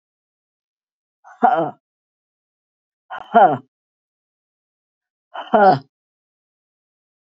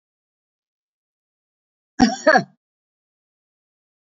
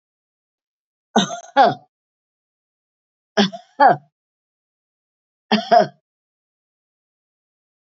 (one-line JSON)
{"exhalation_length": "7.3 s", "exhalation_amplitude": 27044, "exhalation_signal_mean_std_ratio": 0.26, "cough_length": "4.0 s", "cough_amplitude": 27314, "cough_signal_mean_std_ratio": 0.2, "three_cough_length": "7.9 s", "three_cough_amplitude": 27845, "three_cough_signal_mean_std_ratio": 0.26, "survey_phase": "beta (2021-08-13 to 2022-03-07)", "age": "65+", "gender": "Female", "wearing_mask": "No", "symptom_runny_or_blocked_nose": true, "symptom_sore_throat": true, "symptom_fatigue": true, "symptom_onset": "4 days", "smoker_status": "Never smoked", "respiratory_condition_asthma": false, "respiratory_condition_other": false, "recruitment_source": "Test and Trace", "submission_delay": "1 day", "covid_test_result": "Positive", "covid_test_method": "RT-qPCR", "covid_ct_value": 23.2, "covid_ct_gene": "ORF1ab gene", "covid_ct_mean": 23.3, "covid_viral_load": "23000 copies/ml", "covid_viral_load_category": "Low viral load (10K-1M copies/ml)"}